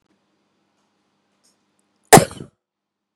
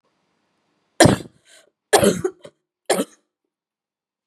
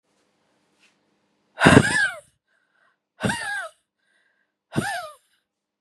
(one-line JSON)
{"cough_length": "3.2 s", "cough_amplitude": 32768, "cough_signal_mean_std_ratio": 0.15, "three_cough_length": "4.3 s", "three_cough_amplitude": 32767, "three_cough_signal_mean_std_ratio": 0.27, "exhalation_length": "5.8 s", "exhalation_amplitude": 32767, "exhalation_signal_mean_std_ratio": 0.29, "survey_phase": "beta (2021-08-13 to 2022-03-07)", "age": "18-44", "gender": "Female", "wearing_mask": "No", "symptom_cough_any": true, "symptom_runny_or_blocked_nose": true, "symptom_shortness_of_breath": true, "symptom_sore_throat": true, "symptom_fatigue": true, "symptom_fever_high_temperature": true, "symptom_headache": true, "symptom_change_to_sense_of_smell_or_taste": true, "symptom_onset": "3 days", "smoker_status": "Never smoked", "respiratory_condition_asthma": false, "respiratory_condition_other": false, "recruitment_source": "Test and Trace", "submission_delay": "1 day", "covid_test_result": "Positive", "covid_test_method": "ePCR"}